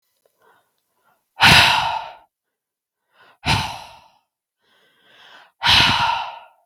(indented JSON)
{
  "exhalation_length": "6.7 s",
  "exhalation_amplitude": 32768,
  "exhalation_signal_mean_std_ratio": 0.37,
  "survey_phase": "beta (2021-08-13 to 2022-03-07)",
  "age": "18-44",
  "gender": "Female",
  "wearing_mask": "No",
  "symptom_fatigue": true,
  "symptom_headache": true,
  "symptom_other": true,
  "smoker_status": "Never smoked",
  "respiratory_condition_asthma": false,
  "respiratory_condition_other": false,
  "recruitment_source": "Test and Trace",
  "submission_delay": "1 day",
  "covid_test_result": "Negative",
  "covid_test_method": "RT-qPCR"
}